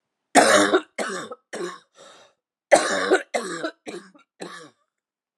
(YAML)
cough_length: 5.4 s
cough_amplitude: 30864
cough_signal_mean_std_ratio: 0.39
survey_phase: beta (2021-08-13 to 2022-03-07)
age: 45-64
gender: Female
wearing_mask: 'No'
symptom_new_continuous_cough: true
symptom_runny_or_blocked_nose: true
symptom_shortness_of_breath: true
symptom_sore_throat: true
symptom_fatigue: true
symptom_change_to_sense_of_smell_or_taste: true
symptom_loss_of_taste: true
symptom_onset: 4 days
smoker_status: Ex-smoker
respiratory_condition_asthma: false
respiratory_condition_other: true
recruitment_source: Test and Trace
submission_delay: 2 days
covid_test_result: Positive
covid_test_method: RT-qPCR
covid_ct_value: 16.3
covid_ct_gene: ORF1ab gene
covid_ct_mean: 17.0
covid_viral_load: 2700000 copies/ml
covid_viral_load_category: High viral load (>1M copies/ml)